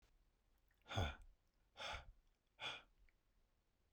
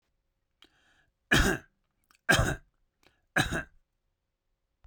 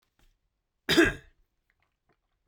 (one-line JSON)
{"exhalation_length": "3.9 s", "exhalation_amplitude": 1009, "exhalation_signal_mean_std_ratio": 0.36, "three_cough_length": "4.9 s", "three_cough_amplitude": 11605, "three_cough_signal_mean_std_ratio": 0.3, "cough_length": "2.5 s", "cough_amplitude": 11751, "cough_signal_mean_std_ratio": 0.24, "survey_phase": "beta (2021-08-13 to 2022-03-07)", "age": "45-64", "gender": "Male", "wearing_mask": "No", "symptom_none": true, "smoker_status": "Never smoked", "respiratory_condition_asthma": false, "respiratory_condition_other": false, "recruitment_source": "REACT", "submission_delay": "4 days", "covid_test_result": "Negative", "covid_test_method": "RT-qPCR"}